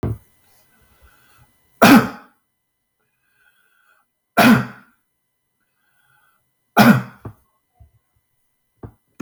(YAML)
three_cough_length: 9.2 s
three_cough_amplitude: 32768
three_cough_signal_mean_std_ratio: 0.25
survey_phase: beta (2021-08-13 to 2022-03-07)
age: 45-64
gender: Male
wearing_mask: 'No'
symptom_none: true
smoker_status: Never smoked
respiratory_condition_asthma: false
respiratory_condition_other: false
recruitment_source: REACT
submission_delay: 2 days
covid_test_result: Negative
covid_test_method: RT-qPCR